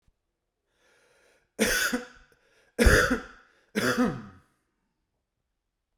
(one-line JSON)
{"three_cough_length": "6.0 s", "three_cough_amplitude": 16540, "three_cough_signal_mean_std_ratio": 0.35, "survey_phase": "beta (2021-08-13 to 2022-03-07)", "age": "45-64", "gender": "Male", "wearing_mask": "No", "symptom_none": true, "smoker_status": "Current smoker (1 to 10 cigarettes per day)", "respiratory_condition_asthma": false, "respiratory_condition_other": false, "recruitment_source": "REACT", "submission_delay": "2 days", "covid_test_result": "Negative", "covid_test_method": "RT-qPCR"}